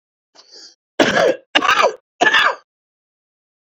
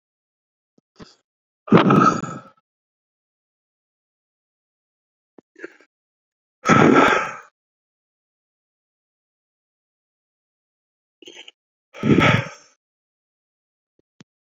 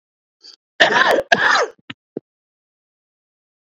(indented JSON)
{
  "three_cough_length": "3.7 s",
  "three_cough_amplitude": 32767,
  "three_cough_signal_mean_std_ratio": 0.43,
  "exhalation_length": "14.5 s",
  "exhalation_amplitude": 27950,
  "exhalation_signal_mean_std_ratio": 0.26,
  "cough_length": "3.7 s",
  "cough_amplitude": 30881,
  "cough_signal_mean_std_ratio": 0.37,
  "survey_phase": "beta (2021-08-13 to 2022-03-07)",
  "age": "18-44",
  "gender": "Male",
  "wearing_mask": "No",
  "symptom_none": true,
  "smoker_status": "Never smoked",
  "respiratory_condition_asthma": false,
  "respiratory_condition_other": false,
  "recruitment_source": "REACT",
  "submission_delay": "3 days",
  "covid_test_result": "Negative",
  "covid_test_method": "RT-qPCR"
}